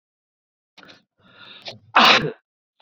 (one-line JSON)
{"cough_length": "2.8 s", "cough_amplitude": 29063, "cough_signal_mean_std_ratio": 0.28, "survey_phase": "beta (2021-08-13 to 2022-03-07)", "age": "18-44", "gender": "Male", "wearing_mask": "No", "symptom_none": true, "smoker_status": "Never smoked", "respiratory_condition_asthma": false, "respiratory_condition_other": false, "recruitment_source": "REACT", "submission_delay": "1 day", "covid_test_result": "Negative", "covid_test_method": "RT-qPCR", "influenza_a_test_result": "Negative", "influenza_b_test_result": "Negative"}